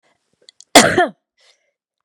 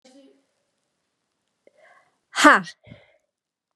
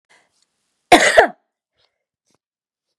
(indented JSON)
{
  "cough_length": "2.0 s",
  "cough_amplitude": 32768,
  "cough_signal_mean_std_ratio": 0.29,
  "exhalation_length": "3.8 s",
  "exhalation_amplitude": 32767,
  "exhalation_signal_mean_std_ratio": 0.19,
  "three_cough_length": "3.0 s",
  "three_cough_amplitude": 32768,
  "three_cough_signal_mean_std_ratio": 0.25,
  "survey_phase": "beta (2021-08-13 to 2022-03-07)",
  "age": "18-44",
  "gender": "Female",
  "wearing_mask": "No",
  "symptom_abdominal_pain": true,
  "symptom_fatigue": true,
  "symptom_onset": "13 days",
  "smoker_status": "Never smoked",
  "respiratory_condition_asthma": true,
  "respiratory_condition_other": false,
  "recruitment_source": "REACT",
  "submission_delay": "2 days",
  "covid_test_result": "Negative",
  "covid_test_method": "RT-qPCR",
  "influenza_a_test_result": "Unknown/Void",
  "influenza_b_test_result": "Unknown/Void"
}